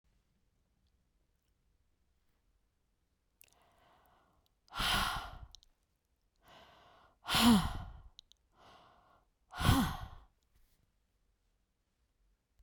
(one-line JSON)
{"exhalation_length": "12.6 s", "exhalation_amplitude": 6502, "exhalation_signal_mean_std_ratio": 0.27, "survey_phase": "beta (2021-08-13 to 2022-03-07)", "age": "45-64", "gender": "Female", "wearing_mask": "No", "symptom_new_continuous_cough": true, "symptom_runny_or_blocked_nose": true, "symptom_sore_throat": true, "symptom_fatigue": true, "symptom_headache": true, "symptom_change_to_sense_of_smell_or_taste": true, "symptom_onset": "4 days", "smoker_status": "Never smoked", "respiratory_condition_asthma": false, "respiratory_condition_other": false, "recruitment_source": "Test and Trace", "submission_delay": "2 days", "covid_test_result": "Positive", "covid_test_method": "RT-qPCR", "covid_ct_value": 23.2, "covid_ct_gene": "ORF1ab gene"}